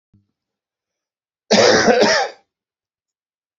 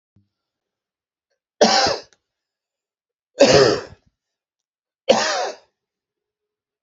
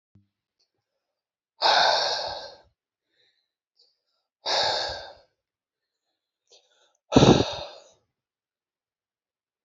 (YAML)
cough_length: 3.6 s
cough_amplitude: 32767
cough_signal_mean_std_ratio: 0.38
three_cough_length: 6.8 s
three_cough_amplitude: 28909
three_cough_signal_mean_std_ratio: 0.31
exhalation_length: 9.6 s
exhalation_amplitude: 25073
exhalation_signal_mean_std_ratio: 0.29
survey_phase: beta (2021-08-13 to 2022-03-07)
age: 45-64
gender: Male
wearing_mask: 'No'
symptom_cough_any: true
symptom_runny_or_blocked_nose: true
symptom_fatigue: true
symptom_headache: true
symptom_change_to_sense_of_smell_or_taste: true
symptom_loss_of_taste: true
symptom_onset: 3 days
smoker_status: Never smoked
respiratory_condition_asthma: false
respiratory_condition_other: false
recruitment_source: Test and Trace
submission_delay: 2 days
covid_test_result: Positive
covid_test_method: RT-qPCR
covid_ct_value: 21.1
covid_ct_gene: ORF1ab gene